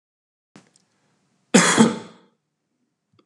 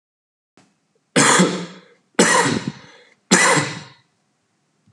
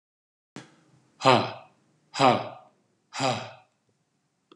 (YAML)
cough_length: 3.3 s
cough_amplitude: 32088
cough_signal_mean_std_ratio: 0.27
three_cough_length: 4.9 s
three_cough_amplitude: 31680
three_cough_signal_mean_std_ratio: 0.43
exhalation_length: 4.6 s
exhalation_amplitude: 23133
exhalation_signal_mean_std_ratio: 0.3
survey_phase: alpha (2021-03-01 to 2021-08-12)
age: 18-44
gender: Male
wearing_mask: 'No'
symptom_none: true
smoker_status: Never smoked
respiratory_condition_asthma: false
respiratory_condition_other: false
recruitment_source: REACT
submission_delay: 2 days
covid_test_result: Negative
covid_test_method: RT-qPCR